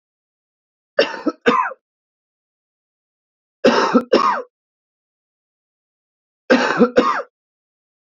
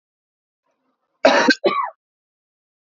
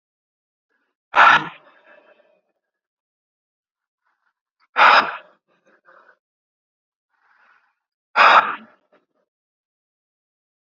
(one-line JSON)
{"three_cough_length": "8.0 s", "three_cough_amplitude": 32768, "three_cough_signal_mean_std_ratio": 0.35, "cough_length": "2.9 s", "cough_amplitude": 27592, "cough_signal_mean_std_ratio": 0.32, "exhalation_length": "10.7 s", "exhalation_amplitude": 32767, "exhalation_signal_mean_std_ratio": 0.24, "survey_phase": "beta (2021-08-13 to 2022-03-07)", "age": "18-44", "gender": "Male", "wearing_mask": "Yes", "symptom_cough_any": true, "symptom_runny_or_blocked_nose": true, "symptom_onset": "3 days", "smoker_status": "Never smoked", "respiratory_condition_asthma": false, "respiratory_condition_other": false, "recruitment_source": "Test and Trace", "submission_delay": "2 days", "covid_test_result": "Positive", "covid_test_method": "ePCR"}